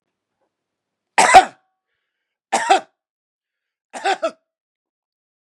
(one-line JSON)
{"three_cough_length": "5.5 s", "three_cough_amplitude": 32768, "three_cough_signal_mean_std_ratio": 0.25, "survey_phase": "beta (2021-08-13 to 2022-03-07)", "age": "45-64", "gender": "Male", "wearing_mask": "No", "symptom_cough_any": true, "symptom_runny_or_blocked_nose": true, "symptom_sore_throat": true, "symptom_fatigue": true, "symptom_fever_high_temperature": true, "symptom_onset": "6 days", "smoker_status": "Current smoker (1 to 10 cigarettes per day)", "respiratory_condition_asthma": false, "respiratory_condition_other": false, "recruitment_source": "Test and Trace", "submission_delay": "2 days", "covid_test_result": "Positive", "covid_test_method": "RT-qPCR", "covid_ct_value": 23.4, "covid_ct_gene": "ORF1ab gene", "covid_ct_mean": 24.1, "covid_viral_load": "12000 copies/ml", "covid_viral_load_category": "Low viral load (10K-1M copies/ml)"}